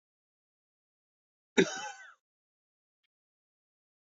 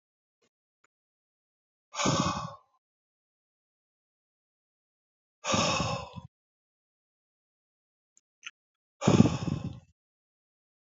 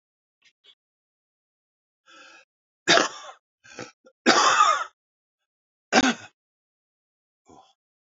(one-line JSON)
{"cough_length": "4.2 s", "cough_amplitude": 10227, "cough_signal_mean_std_ratio": 0.16, "exhalation_length": "10.8 s", "exhalation_amplitude": 20704, "exhalation_signal_mean_std_ratio": 0.27, "three_cough_length": "8.2 s", "three_cough_amplitude": 26718, "three_cough_signal_mean_std_ratio": 0.28, "survey_phase": "alpha (2021-03-01 to 2021-08-12)", "age": "45-64", "gender": "Male", "wearing_mask": "No", "symptom_cough_any": true, "symptom_fatigue": true, "symptom_change_to_sense_of_smell_or_taste": true, "symptom_onset": "4 days", "smoker_status": "Never smoked", "respiratory_condition_asthma": false, "respiratory_condition_other": false, "recruitment_source": "Test and Trace", "submission_delay": "1 day", "covid_test_result": "Positive", "covid_test_method": "RT-qPCR", "covid_ct_value": 15.3, "covid_ct_gene": "ORF1ab gene"}